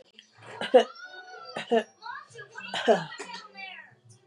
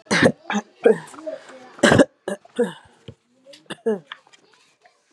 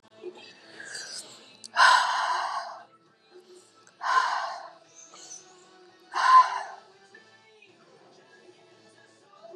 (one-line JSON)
{"three_cough_length": "4.3 s", "three_cough_amplitude": 16091, "three_cough_signal_mean_std_ratio": 0.36, "cough_length": "5.1 s", "cough_amplitude": 30007, "cough_signal_mean_std_ratio": 0.35, "exhalation_length": "9.6 s", "exhalation_amplitude": 16289, "exhalation_signal_mean_std_ratio": 0.36, "survey_phase": "beta (2021-08-13 to 2022-03-07)", "age": "18-44", "gender": "Female", "wearing_mask": "No", "symptom_cough_any": true, "symptom_sore_throat": true, "smoker_status": "Ex-smoker", "respiratory_condition_asthma": false, "respiratory_condition_other": false, "recruitment_source": "Test and Trace", "submission_delay": "1 day", "covid_test_result": "Positive", "covid_test_method": "RT-qPCR"}